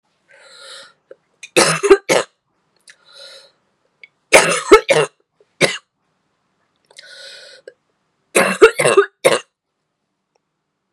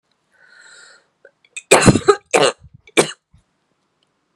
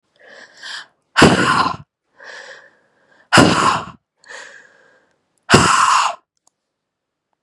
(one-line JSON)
{"three_cough_length": "10.9 s", "three_cough_amplitude": 32768, "three_cough_signal_mean_std_ratio": 0.31, "cough_length": "4.4 s", "cough_amplitude": 32768, "cough_signal_mean_std_ratio": 0.29, "exhalation_length": "7.4 s", "exhalation_amplitude": 32768, "exhalation_signal_mean_std_ratio": 0.39, "survey_phase": "beta (2021-08-13 to 2022-03-07)", "age": "18-44", "gender": "Female", "wearing_mask": "No", "symptom_cough_any": true, "symptom_runny_or_blocked_nose": true, "symptom_sore_throat": true, "symptom_fatigue": true, "symptom_fever_high_temperature": true, "symptom_change_to_sense_of_smell_or_taste": true, "symptom_loss_of_taste": true, "symptom_onset": "3 days", "smoker_status": "Never smoked", "respiratory_condition_asthma": false, "respiratory_condition_other": false, "recruitment_source": "Test and Trace", "submission_delay": "1 day", "covid_test_result": "Positive", "covid_test_method": "RT-qPCR", "covid_ct_value": 16.7, "covid_ct_gene": "ORF1ab gene"}